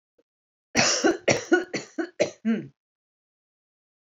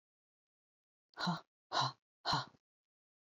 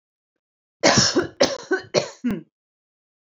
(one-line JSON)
{"three_cough_length": "4.1 s", "three_cough_amplitude": 21164, "three_cough_signal_mean_std_ratio": 0.4, "exhalation_length": "3.2 s", "exhalation_amplitude": 2922, "exhalation_signal_mean_std_ratio": 0.33, "cough_length": "3.2 s", "cough_amplitude": 29144, "cough_signal_mean_std_ratio": 0.41, "survey_phase": "alpha (2021-03-01 to 2021-08-12)", "age": "45-64", "gender": "Female", "wearing_mask": "No", "symptom_none": true, "smoker_status": "Ex-smoker", "respiratory_condition_asthma": false, "respiratory_condition_other": false, "recruitment_source": "REACT", "submission_delay": "2 days", "covid_test_result": "Negative", "covid_test_method": "RT-qPCR"}